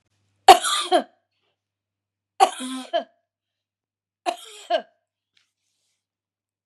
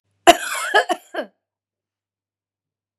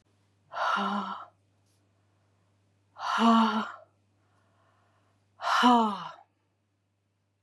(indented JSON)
{
  "three_cough_length": "6.7 s",
  "three_cough_amplitude": 32768,
  "three_cough_signal_mean_std_ratio": 0.23,
  "cough_length": "3.0 s",
  "cough_amplitude": 32768,
  "cough_signal_mean_std_ratio": 0.27,
  "exhalation_length": "7.4 s",
  "exhalation_amplitude": 11380,
  "exhalation_signal_mean_std_ratio": 0.39,
  "survey_phase": "beta (2021-08-13 to 2022-03-07)",
  "age": "65+",
  "gender": "Female",
  "wearing_mask": "No",
  "symptom_none": true,
  "smoker_status": "Ex-smoker",
  "respiratory_condition_asthma": false,
  "respiratory_condition_other": false,
  "recruitment_source": "REACT",
  "submission_delay": "1 day",
  "covid_test_result": "Negative",
  "covid_test_method": "RT-qPCR",
  "influenza_a_test_result": "Negative",
  "influenza_b_test_result": "Negative"
}